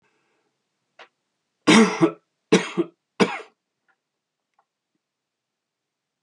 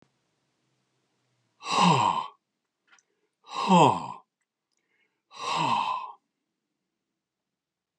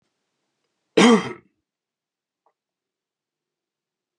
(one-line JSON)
{"three_cough_length": "6.2 s", "three_cough_amplitude": 26283, "three_cough_signal_mean_std_ratio": 0.25, "exhalation_length": "8.0 s", "exhalation_amplitude": 16720, "exhalation_signal_mean_std_ratio": 0.34, "cough_length": "4.2 s", "cough_amplitude": 26793, "cough_signal_mean_std_ratio": 0.2, "survey_phase": "beta (2021-08-13 to 2022-03-07)", "age": "65+", "gender": "Male", "wearing_mask": "No", "symptom_none": true, "smoker_status": "Never smoked", "respiratory_condition_asthma": false, "respiratory_condition_other": false, "recruitment_source": "REACT", "submission_delay": "1 day", "covid_test_result": "Negative", "covid_test_method": "RT-qPCR"}